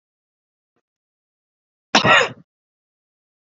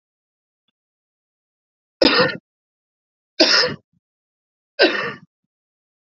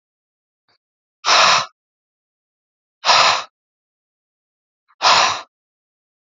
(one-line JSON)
{"cough_length": "3.6 s", "cough_amplitude": 31355, "cough_signal_mean_std_ratio": 0.23, "three_cough_length": "6.1 s", "three_cough_amplitude": 32767, "three_cough_signal_mean_std_ratio": 0.29, "exhalation_length": "6.2 s", "exhalation_amplitude": 32768, "exhalation_signal_mean_std_ratio": 0.34, "survey_phase": "alpha (2021-03-01 to 2021-08-12)", "age": "45-64", "gender": "Male", "wearing_mask": "No", "symptom_none": true, "smoker_status": "Never smoked", "respiratory_condition_asthma": false, "respiratory_condition_other": false, "recruitment_source": "REACT", "submission_delay": "1 day", "covid_test_result": "Negative", "covid_test_method": "RT-qPCR"}